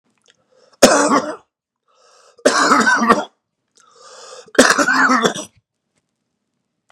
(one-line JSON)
{"three_cough_length": "6.9 s", "three_cough_amplitude": 32768, "three_cough_signal_mean_std_ratio": 0.43, "survey_phase": "beta (2021-08-13 to 2022-03-07)", "age": "18-44", "gender": "Male", "wearing_mask": "No", "symptom_cough_any": true, "symptom_runny_or_blocked_nose": true, "symptom_sore_throat": true, "symptom_abdominal_pain": true, "symptom_diarrhoea": true, "symptom_fatigue": true, "symptom_change_to_sense_of_smell_or_taste": true, "symptom_other": true, "symptom_onset": "4 days", "smoker_status": "Current smoker (11 or more cigarettes per day)", "respiratory_condition_asthma": false, "respiratory_condition_other": false, "recruitment_source": "Test and Trace", "submission_delay": "1 day", "covid_test_result": "Positive", "covid_test_method": "RT-qPCR", "covid_ct_value": 31.2, "covid_ct_gene": "N gene"}